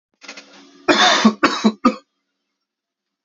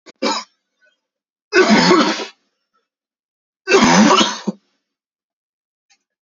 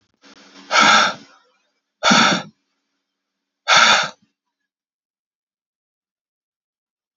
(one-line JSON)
{"cough_length": "3.2 s", "cough_amplitude": 30908, "cough_signal_mean_std_ratio": 0.4, "three_cough_length": "6.2 s", "three_cough_amplitude": 32621, "three_cough_signal_mean_std_ratio": 0.41, "exhalation_length": "7.2 s", "exhalation_amplitude": 29263, "exhalation_signal_mean_std_ratio": 0.33, "survey_phase": "beta (2021-08-13 to 2022-03-07)", "age": "18-44", "gender": "Male", "wearing_mask": "No", "symptom_cough_any": true, "symptom_new_continuous_cough": true, "symptom_runny_or_blocked_nose": true, "symptom_sore_throat": true, "symptom_fatigue": true, "symptom_fever_high_temperature": true, "symptom_other": true, "smoker_status": "Never smoked", "respiratory_condition_asthma": true, "respiratory_condition_other": false, "recruitment_source": "Test and Trace", "submission_delay": "2 days", "covid_test_result": "Positive", "covid_test_method": "RT-qPCR", "covid_ct_value": 25.2, "covid_ct_gene": "N gene"}